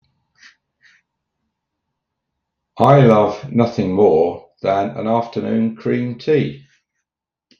{
  "exhalation_length": "7.6 s",
  "exhalation_amplitude": 32768,
  "exhalation_signal_mean_std_ratio": 0.49,
  "survey_phase": "beta (2021-08-13 to 2022-03-07)",
  "age": "65+",
  "gender": "Male",
  "wearing_mask": "No",
  "symptom_cough_any": true,
  "symptom_sore_throat": true,
  "smoker_status": "Never smoked",
  "respiratory_condition_asthma": false,
  "respiratory_condition_other": false,
  "recruitment_source": "REACT",
  "submission_delay": "9 days",
  "covid_test_result": "Negative",
  "covid_test_method": "RT-qPCR",
  "influenza_a_test_result": "Negative",
  "influenza_b_test_result": "Negative"
}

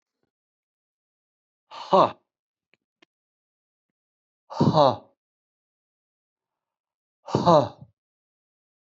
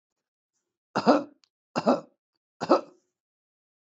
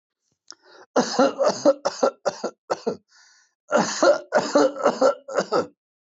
{
  "exhalation_length": "9.0 s",
  "exhalation_amplitude": 20418,
  "exhalation_signal_mean_std_ratio": 0.23,
  "three_cough_length": "3.9 s",
  "three_cough_amplitude": 16729,
  "three_cough_signal_mean_std_ratio": 0.27,
  "cough_length": "6.1 s",
  "cough_amplitude": 17735,
  "cough_signal_mean_std_ratio": 0.49,
  "survey_phase": "beta (2021-08-13 to 2022-03-07)",
  "age": "45-64",
  "gender": "Male",
  "wearing_mask": "No",
  "symptom_runny_or_blocked_nose": true,
  "smoker_status": "Ex-smoker",
  "respiratory_condition_asthma": false,
  "respiratory_condition_other": false,
  "recruitment_source": "REACT",
  "submission_delay": "1 day",
  "covid_test_result": "Negative",
  "covid_test_method": "RT-qPCR",
  "influenza_a_test_result": "Negative",
  "influenza_b_test_result": "Negative"
}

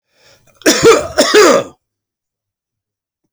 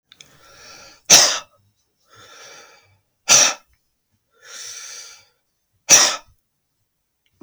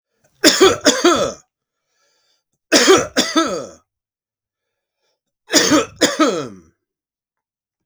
{
  "cough_length": "3.3 s",
  "cough_amplitude": 32768,
  "cough_signal_mean_std_ratio": 0.42,
  "exhalation_length": "7.4 s",
  "exhalation_amplitude": 32768,
  "exhalation_signal_mean_std_ratio": 0.27,
  "three_cough_length": "7.9 s",
  "three_cough_amplitude": 32768,
  "three_cough_signal_mean_std_ratio": 0.41,
  "survey_phase": "beta (2021-08-13 to 2022-03-07)",
  "age": "45-64",
  "gender": "Male",
  "wearing_mask": "No",
  "symptom_none": true,
  "smoker_status": "Never smoked",
  "respiratory_condition_asthma": true,
  "respiratory_condition_other": false,
  "recruitment_source": "REACT",
  "submission_delay": "1 day",
  "covid_test_result": "Negative",
  "covid_test_method": "RT-qPCR",
  "influenza_a_test_result": "Negative",
  "influenza_b_test_result": "Negative"
}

